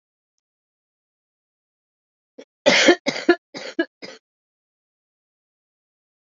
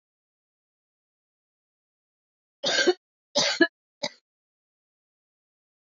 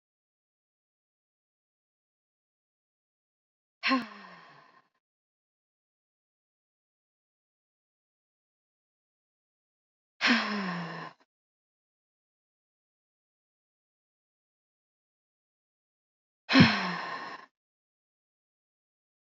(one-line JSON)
{"cough_length": "6.4 s", "cough_amplitude": 28471, "cough_signal_mean_std_ratio": 0.22, "three_cough_length": "5.9 s", "three_cough_amplitude": 16515, "three_cough_signal_mean_std_ratio": 0.24, "exhalation_length": "19.4 s", "exhalation_amplitude": 16026, "exhalation_signal_mean_std_ratio": 0.19, "survey_phase": "alpha (2021-03-01 to 2021-08-12)", "age": "45-64", "gender": "Female", "wearing_mask": "No", "symptom_cough_any": true, "symptom_change_to_sense_of_smell_or_taste": true, "symptom_loss_of_taste": true, "symptom_onset": "4 days", "smoker_status": "Ex-smoker", "respiratory_condition_asthma": false, "respiratory_condition_other": false, "recruitment_source": "Test and Trace", "submission_delay": "2 days", "covid_test_result": "Positive", "covid_test_method": "RT-qPCR", "covid_ct_value": 26.3, "covid_ct_gene": "ORF1ab gene", "covid_ct_mean": 26.9, "covid_viral_load": "1600 copies/ml", "covid_viral_load_category": "Minimal viral load (< 10K copies/ml)"}